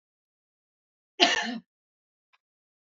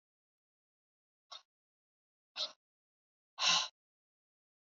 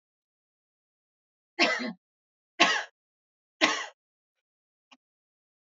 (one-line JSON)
{"cough_length": "2.8 s", "cough_amplitude": 25771, "cough_signal_mean_std_ratio": 0.24, "exhalation_length": "4.8 s", "exhalation_amplitude": 4058, "exhalation_signal_mean_std_ratio": 0.21, "three_cough_length": "5.6 s", "three_cough_amplitude": 20225, "three_cough_signal_mean_std_ratio": 0.26, "survey_phase": "alpha (2021-03-01 to 2021-08-12)", "age": "18-44", "gender": "Female", "wearing_mask": "No", "symptom_none": true, "symptom_onset": "2 days", "smoker_status": "Ex-smoker", "respiratory_condition_asthma": false, "respiratory_condition_other": false, "recruitment_source": "REACT", "submission_delay": "2 days", "covid_test_result": "Negative", "covid_test_method": "RT-qPCR"}